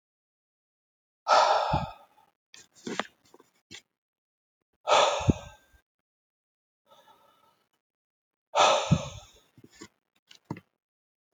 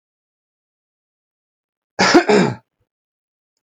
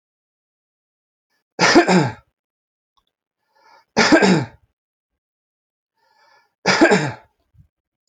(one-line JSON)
{"exhalation_length": "11.3 s", "exhalation_amplitude": 13043, "exhalation_signal_mean_std_ratio": 0.29, "cough_length": "3.6 s", "cough_amplitude": 29815, "cough_signal_mean_std_ratio": 0.28, "three_cough_length": "8.1 s", "three_cough_amplitude": 28556, "three_cough_signal_mean_std_ratio": 0.32, "survey_phase": "beta (2021-08-13 to 2022-03-07)", "age": "18-44", "gender": "Male", "wearing_mask": "No", "symptom_none": true, "smoker_status": "Ex-smoker", "respiratory_condition_asthma": false, "respiratory_condition_other": false, "recruitment_source": "REACT", "submission_delay": "1 day", "covid_test_result": "Negative", "covid_test_method": "RT-qPCR"}